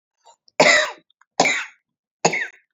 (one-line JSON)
{"three_cough_length": "2.7 s", "three_cough_amplitude": 31036, "three_cough_signal_mean_std_ratio": 0.39, "survey_phase": "beta (2021-08-13 to 2022-03-07)", "age": "18-44", "gender": "Female", "wearing_mask": "No", "symptom_none": true, "symptom_onset": "3 days", "smoker_status": "Never smoked", "respiratory_condition_asthma": false, "respiratory_condition_other": false, "recruitment_source": "REACT", "submission_delay": "1 day", "covid_test_result": "Negative", "covid_test_method": "RT-qPCR"}